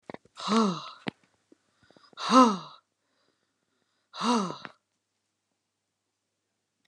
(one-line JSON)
{"exhalation_length": "6.9 s", "exhalation_amplitude": 17405, "exhalation_signal_mean_std_ratio": 0.28, "survey_phase": "beta (2021-08-13 to 2022-03-07)", "age": "65+", "gender": "Female", "wearing_mask": "No", "symptom_none": true, "smoker_status": "Never smoked", "respiratory_condition_asthma": false, "respiratory_condition_other": false, "recruitment_source": "REACT", "submission_delay": "1 day", "covid_test_result": "Negative", "covid_test_method": "RT-qPCR", "influenza_a_test_result": "Negative", "influenza_b_test_result": "Negative"}